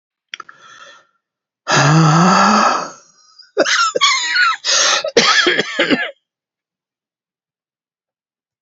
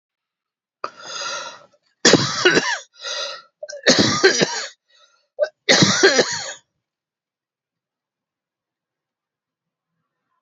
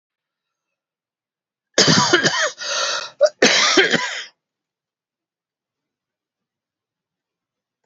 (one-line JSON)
{"exhalation_length": "8.6 s", "exhalation_amplitude": 32555, "exhalation_signal_mean_std_ratio": 0.55, "three_cough_length": "10.4 s", "three_cough_amplitude": 32767, "three_cough_signal_mean_std_ratio": 0.38, "cough_length": "7.9 s", "cough_amplitude": 32768, "cough_signal_mean_std_ratio": 0.38, "survey_phase": "beta (2021-08-13 to 2022-03-07)", "age": "65+", "gender": "Male", "wearing_mask": "No", "symptom_cough_any": true, "symptom_fatigue": true, "symptom_other": true, "smoker_status": "Ex-smoker", "respiratory_condition_asthma": false, "respiratory_condition_other": false, "recruitment_source": "Test and Trace", "submission_delay": "2 days", "covid_test_result": "Positive", "covid_test_method": "RT-qPCR", "covid_ct_value": 12.1, "covid_ct_gene": "ORF1ab gene", "covid_ct_mean": 12.4, "covid_viral_load": "85000000 copies/ml", "covid_viral_load_category": "High viral load (>1M copies/ml)"}